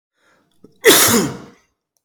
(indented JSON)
{
  "cough_length": "2.0 s",
  "cough_amplitude": 32768,
  "cough_signal_mean_std_ratio": 0.4,
  "survey_phase": "beta (2021-08-13 to 2022-03-07)",
  "age": "45-64",
  "gender": "Male",
  "wearing_mask": "No",
  "symptom_cough_any": true,
  "symptom_new_continuous_cough": true,
  "symptom_runny_or_blocked_nose": true,
  "symptom_other": true,
  "symptom_onset": "3 days",
  "smoker_status": "Never smoked",
  "respiratory_condition_asthma": true,
  "respiratory_condition_other": false,
  "recruitment_source": "REACT",
  "submission_delay": "1 day",
  "covid_test_result": "Negative",
  "covid_test_method": "RT-qPCR",
  "influenza_a_test_result": "Negative",
  "influenza_b_test_result": "Negative"
}